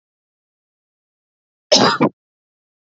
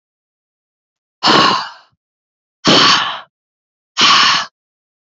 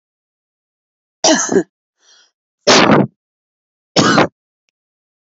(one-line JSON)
{"cough_length": "2.9 s", "cough_amplitude": 32429, "cough_signal_mean_std_ratio": 0.27, "exhalation_length": "5.0 s", "exhalation_amplitude": 31891, "exhalation_signal_mean_std_ratio": 0.44, "three_cough_length": "5.2 s", "three_cough_amplitude": 32767, "three_cough_signal_mean_std_ratio": 0.37, "survey_phase": "beta (2021-08-13 to 2022-03-07)", "age": "18-44", "gender": "Female", "wearing_mask": "No", "symptom_none": true, "smoker_status": "Ex-smoker", "respiratory_condition_asthma": true, "respiratory_condition_other": false, "recruitment_source": "REACT", "submission_delay": "1 day", "covid_test_result": "Negative", "covid_test_method": "RT-qPCR", "influenza_a_test_result": "Negative", "influenza_b_test_result": "Negative"}